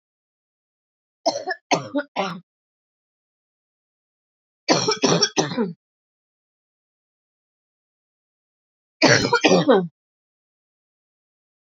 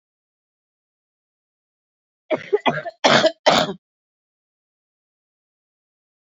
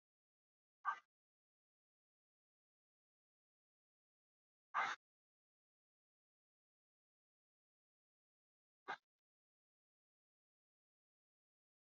{"three_cough_length": "11.8 s", "three_cough_amplitude": 30535, "three_cough_signal_mean_std_ratio": 0.31, "cough_length": "6.4 s", "cough_amplitude": 27601, "cough_signal_mean_std_ratio": 0.26, "exhalation_length": "11.9 s", "exhalation_amplitude": 1220, "exhalation_signal_mean_std_ratio": 0.13, "survey_phase": "beta (2021-08-13 to 2022-03-07)", "age": "45-64", "gender": "Female", "wearing_mask": "No", "symptom_cough_any": true, "symptom_change_to_sense_of_smell_or_taste": true, "symptom_loss_of_taste": true, "symptom_onset": "3 days", "smoker_status": "Current smoker (1 to 10 cigarettes per day)", "respiratory_condition_asthma": false, "respiratory_condition_other": false, "recruitment_source": "Test and Trace", "submission_delay": "2 days", "covid_test_result": "Positive", "covid_test_method": "RT-qPCR", "covid_ct_value": 19.4, "covid_ct_gene": "ORF1ab gene", "covid_ct_mean": 20.0, "covid_viral_load": "270000 copies/ml", "covid_viral_load_category": "Low viral load (10K-1M copies/ml)"}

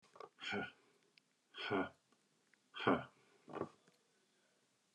{"exhalation_length": "4.9 s", "exhalation_amplitude": 3210, "exhalation_signal_mean_std_ratio": 0.33, "survey_phase": "beta (2021-08-13 to 2022-03-07)", "age": "45-64", "gender": "Male", "wearing_mask": "No", "symptom_none": true, "smoker_status": "Ex-smoker", "respiratory_condition_asthma": false, "respiratory_condition_other": false, "recruitment_source": "REACT", "submission_delay": "3 days", "covid_test_result": "Negative", "covid_test_method": "RT-qPCR", "influenza_a_test_result": "Negative", "influenza_b_test_result": "Negative"}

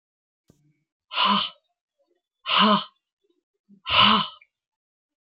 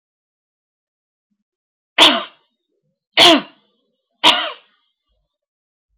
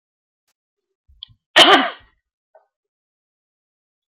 {"exhalation_length": "5.2 s", "exhalation_amplitude": 20843, "exhalation_signal_mean_std_ratio": 0.36, "three_cough_length": "6.0 s", "three_cough_amplitude": 32050, "three_cough_signal_mean_std_ratio": 0.26, "cough_length": "4.1 s", "cough_amplitude": 30152, "cough_signal_mean_std_ratio": 0.22, "survey_phase": "beta (2021-08-13 to 2022-03-07)", "age": "45-64", "gender": "Female", "wearing_mask": "No", "symptom_none": true, "smoker_status": "Current smoker (11 or more cigarettes per day)", "respiratory_condition_asthma": false, "respiratory_condition_other": false, "recruitment_source": "REACT", "submission_delay": "2 days", "covid_test_result": "Negative", "covid_test_method": "RT-qPCR"}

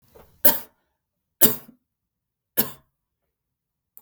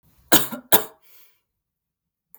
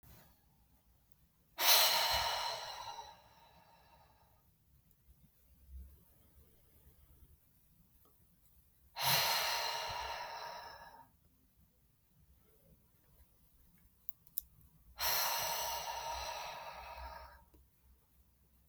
{"three_cough_length": "4.0 s", "three_cough_amplitude": 32766, "three_cough_signal_mean_std_ratio": 0.21, "cough_length": "2.4 s", "cough_amplitude": 32768, "cough_signal_mean_std_ratio": 0.24, "exhalation_length": "18.7 s", "exhalation_amplitude": 8599, "exhalation_signal_mean_std_ratio": 0.4, "survey_phase": "beta (2021-08-13 to 2022-03-07)", "age": "18-44", "gender": "Female", "wearing_mask": "No", "symptom_none": true, "smoker_status": "Never smoked", "respiratory_condition_asthma": false, "respiratory_condition_other": false, "recruitment_source": "REACT", "submission_delay": "5 days", "covid_test_result": "Negative", "covid_test_method": "RT-qPCR", "influenza_a_test_result": "Negative", "influenza_b_test_result": "Negative"}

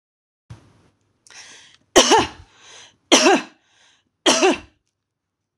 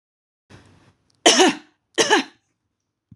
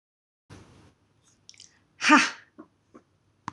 {"three_cough_length": "5.6 s", "three_cough_amplitude": 26028, "three_cough_signal_mean_std_ratio": 0.32, "cough_length": "3.2 s", "cough_amplitude": 26028, "cough_signal_mean_std_ratio": 0.32, "exhalation_length": "3.5 s", "exhalation_amplitude": 22755, "exhalation_signal_mean_std_ratio": 0.22, "survey_phase": "beta (2021-08-13 to 2022-03-07)", "age": "45-64", "gender": "Female", "wearing_mask": "No", "symptom_none": true, "smoker_status": "Never smoked", "respiratory_condition_asthma": false, "respiratory_condition_other": false, "recruitment_source": "REACT", "submission_delay": "4 days", "covid_test_result": "Negative", "covid_test_method": "RT-qPCR", "influenza_a_test_result": "Negative", "influenza_b_test_result": "Negative"}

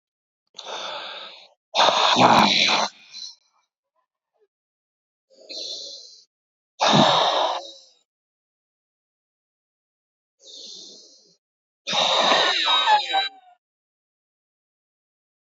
{"exhalation_length": "15.4 s", "exhalation_amplitude": 27638, "exhalation_signal_mean_std_ratio": 0.41, "survey_phase": "beta (2021-08-13 to 2022-03-07)", "age": "45-64", "gender": "Male", "wearing_mask": "No", "symptom_none": true, "smoker_status": "Current smoker (1 to 10 cigarettes per day)", "respiratory_condition_asthma": true, "respiratory_condition_other": false, "recruitment_source": "Test and Trace", "submission_delay": "0 days", "covid_test_result": "Negative", "covid_test_method": "LFT"}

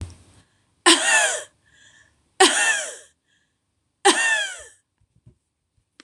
{"three_cough_length": "6.0 s", "three_cough_amplitude": 26027, "three_cough_signal_mean_std_ratio": 0.38, "survey_phase": "beta (2021-08-13 to 2022-03-07)", "age": "65+", "gender": "Female", "wearing_mask": "No", "symptom_none": true, "smoker_status": "Never smoked", "respiratory_condition_asthma": true, "respiratory_condition_other": false, "recruitment_source": "REACT", "submission_delay": "1 day", "covid_test_result": "Negative", "covid_test_method": "RT-qPCR", "influenza_a_test_result": "Negative", "influenza_b_test_result": "Negative"}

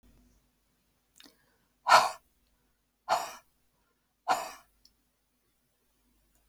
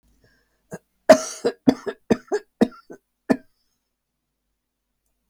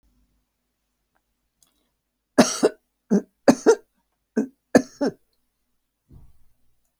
{"exhalation_length": "6.5 s", "exhalation_amplitude": 16742, "exhalation_signal_mean_std_ratio": 0.21, "cough_length": "5.3 s", "cough_amplitude": 31852, "cough_signal_mean_std_ratio": 0.22, "three_cough_length": "7.0 s", "three_cough_amplitude": 29465, "three_cough_signal_mean_std_ratio": 0.23, "survey_phase": "alpha (2021-03-01 to 2021-08-12)", "age": "65+", "gender": "Female", "wearing_mask": "No", "symptom_shortness_of_breath": true, "smoker_status": "Never smoked", "respiratory_condition_asthma": false, "respiratory_condition_other": false, "recruitment_source": "REACT", "submission_delay": "1 day", "covid_test_result": "Negative", "covid_test_method": "RT-qPCR"}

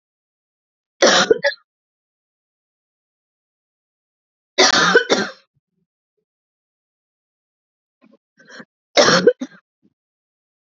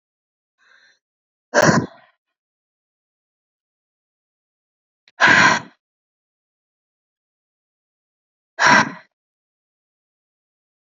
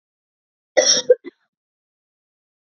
{"three_cough_length": "10.8 s", "three_cough_amplitude": 32767, "three_cough_signal_mean_std_ratio": 0.28, "exhalation_length": "10.9 s", "exhalation_amplitude": 30621, "exhalation_signal_mean_std_ratio": 0.23, "cough_length": "2.6 s", "cough_amplitude": 29779, "cough_signal_mean_std_ratio": 0.25, "survey_phase": "beta (2021-08-13 to 2022-03-07)", "age": "45-64", "gender": "Female", "wearing_mask": "No", "symptom_runny_or_blocked_nose": true, "symptom_sore_throat": true, "smoker_status": "Ex-smoker", "respiratory_condition_asthma": false, "respiratory_condition_other": false, "recruitment_source": "Test and Trace", "submission_delay": "2 days", "covid_test_result": "Positive", "covid_test_method": "RT-qPCR", "covid_ct_value": 27.4, "covid_ct_gene": "ORF1ab gene", "covid_ct_mean": 27.5, "covid_viral_load": "970 copies/ml", "covid_viral_load_category": "Minimal viral load (< 10K copies/ml)"}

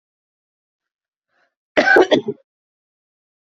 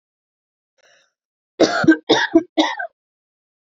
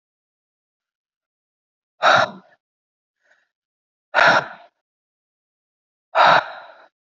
{"cough_length": "3.4 s", "cough_amplitude": 28360, "cough_signal_mean_std_ratio": 0.27, "three_cough_length": "3.8 s", "three_cough_amplitude": 32768, "three_cough_signal_mean_std_ratio": 0.34, "exhalation_length": "7.2 s", "exhalation_amplitude": 26626, "exhalation_signal_mean_std_ratio": 0.27, "survey_phase": "beta (2021-08-13 to 2022-03-07)", "age": "18-44", "gender": "Female", "wearing_mask": "No", "symptom_cough_any": true, "symptom_runny_or_blocked_nose": true, "symptom_diarrhoea": true, "symptom_fatigue": true, "smoker_status": "Current smoker (e-cigarettes or vapes only)", "respiratory_condition_asthma": false, "respiratory_condition_other": false, "recruitment_source": "Test and Trace", "submission_delay": "2 days", "covid_test_result": "Positive", "covid_test_method": "RT-qPCR", "covid_ct_value": 33.4, "covid_ct_gene": "ORF1ab gene", "covid_ct_mean": 33.4, "covid_viral_load": "11 copies/ml", "covid_viral_load_category": "Minimal viral load (< 10K copies/ml)"}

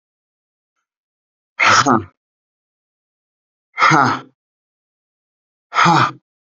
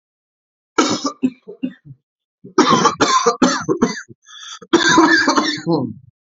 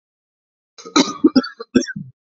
{"exhalation_length": "6.6 s", "exhalation_amplitude": 32767, "exhalation_signal_mean_std_ratio": 0.34, "three_cough_length": "6.3 s", "three_cough_amplitude": 29679, "three_cough_signal_mean_std_ratio": 0.55, "cough_length": "2.3 s", "cough_amplitude": 29911, "cough_signal_mean_std_ratio": 0.33, "survey_phase": "beta (2021-08-13 to 2022-03-07)", "age": "18-44", "gender": "Male", "wearing_mask": "No", "symptom_cough_any": true, "symptom_new_continuous_cough": true, "symptom_runny_or_blocked_nose": true, "symptom_sore_throat": true, "symptom_diarrhoea": true, "symptom_onset": "3 days", "smoker_status": "Never smoked", "respiratory_condition_asthma": false, "respiratory_condition_other": false, "recruitment_source": "Test and Trace", "submission_delay": "1 day", "covid_test_result": "Positive", "covid_test_method": "RT-qPCR", "covid_ct_value": 13.7, "covid_ct_gene": "ORF1ab gene"}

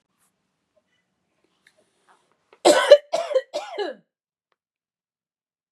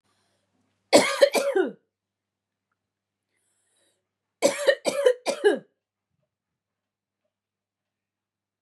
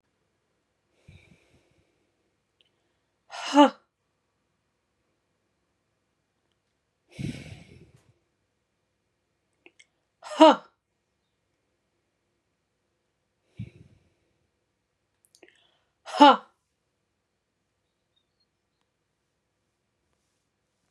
{"cough_length": "5.7 s", "cough_amplitude": 32142, "cough_signal_mean_std_ratio": 0.23, "three_cough_length": "8.6 s", "three_cough_amplitude": 23056, "three_cough_signal_mean_std_ratio": 0.29, "exhalation_length": "20.9 s", "exhalation_amplitude": 25564, "exhalation_signal_mean_std_ratio": 0.14, "survey_phase": "beta (2021-08-13 to 2022-03-07)", "age": "18-44", "gender": "Female", "wearing_mask": "No", "symptom_sore_throat": true, "smoker_status": "Never smoked", "respiratory_condition_asthma": true, "respiratory_condition_other": false, "recruitment_source": "REACT", "submission_delay": "1 day", "covid_test_result": "Negative", "covid_test_method": "RT-qPCR", "influenza_a_test_result": "Negative", "influenza_b_test_result": "Negative"}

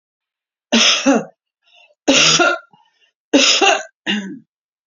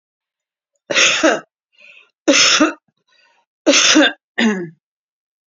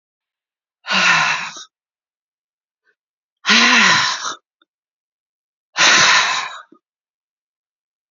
{"three_cough_length": "4.9 s", "three_cough_amplitude": 32768, "three_cough_signal_mean_std_ratio": 0.49, "cough_length": "5.5 s", "cough_amplitude": 32768, "cough_signal_mean_std_ratio": 0.45, "exhalation_length": "8.1 s", "exhalation_amplitude": 32768, "exhalation_signal_mean_std_ratio": 0.41, "survey_phase": "beta (2021-08-13 to 2022-03-07)", "age": "65+", "gender": "Female", "wearing_mask": "No", "symptom_cough_any": true, "symptom_runny_or_blocked_nose": true, "symptom_shortness_of_breath": true, "symptom_fatigue": true, "symptom_onset": "12 days", "smoker_status": "Ex-smoker", "respiratory_condition_asthma": false, "respiratory_condition_other": false, "recruitment_source": "REACT", "submission_delay": "1 day", "covid_test_result": "Negative", "covid_test_method": "RT-qPCR", "influenza_a_test_result": "Unknown/Void", "influenza_b_test_result": "Unknown/Void"}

